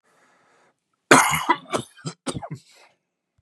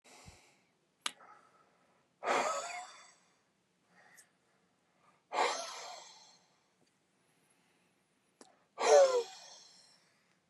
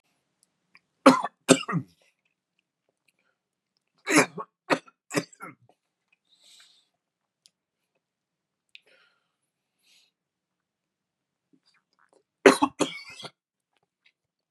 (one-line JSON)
{"cough_length": "3.4 s", "cough_amplitude": 32768, "cough_signal_mean_std_ratio": 0.3, "exhalation_length": "10.5 s", "exhalation_amplitude": 7365, "exhalation_signal_mean_std_ratio": 0.28, "three_cough_length": "14.5 s", "three_cough_amplitude": 30911, "three_cough_signal_mean_std_ratio": 0.18, "survey_phase": "beta (2021-08-13 to 2022-03-07)", "age": "45-64", "gender": "Male", "wearing_mask": "No", "symptom_none": true, "smoker_status": "Never smoked", "respiratory_condition_asthma": false, "respiratory_condition_other": false, "recruitment_source": "REACT", "submission_delay": "1 day", "covid_test_result": "Negative", "covid_test_method": "RT-qPCR", "influenza_a_test_result": "Negative", "influenza_b_test_result": "Negative"}